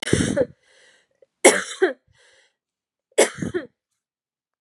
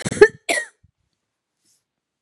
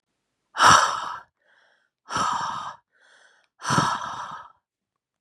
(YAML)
three_cough_length: 4.6 s
three_cough_amplitude: 32767
three_cough_signal_mean_std_ratio: 0.31
cough_length: 2.2 s
cough_amplitude: 32768
cough_signal_mean_std_ratio: 0.22
exhalation_length: 5.2 s
exhalation_amplitude: 28144
exhalation_signal_mean_std_ratio: 0.39
survey_phase: beta (2021-08-13 to 2022-03-07)
age: 18-44
gender: Female
wearing_mask: 'No'
symptom_cough_any: true
symptom_runny_or_blocked_nose: true
symptom_sore_throat: true
symptom_fatigue: true
symptom_fever_high_temperature: true
symptom_headache: true
symptom_change_to_sense_of_smell_or_taste: true
symptom_loss_of_taste: true
symptom_onset: 3 days
smoker_status: Never smoked
respiratory_condition_asthma: false
respiratory_condition_other: false
recruitment_source: Test and Trace
submission_delay: 2 days
covid_test_result: Positive
covid_test_method: RT-qPCR
covid_ct_value: 28.9
covid_ct_gene: ORF1ab gene
covid_ct_mean: 29.6
covid_viral_load: 200 copies/ml
covid_viral_load_category: Minimal viral load (< 10K copies/ml)